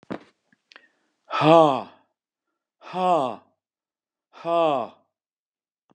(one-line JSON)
{"exhalation_length": "5.9 s", "exhalation_amplitude": 26132, "exhalation_signal_mean_std_ratio": 0.32, "survey_phase": "beta (2021-08-13 to 2022-03-07)", "age": "65+", "gender": "Male", "wearing_mask": "No", "symptom_cough_any": true, "symptom_runny_or_blocked_nose": true, "symptom_onset": "13 days", "smoker_status": "Never smoked", "respiratory_condition_asthma": false, "respiratory_condition_other": false, "recruitment_source": "REACT", "submission_delay": "1 day", "covid_test_result": "Negative", "covid_test_method": "RT-qPCR", "covid_ct_value": 38.0, "covid_ct_gene": "N gene", "influenza_a_test_result": "Negative", "influenza_b_test_result": "Negative"}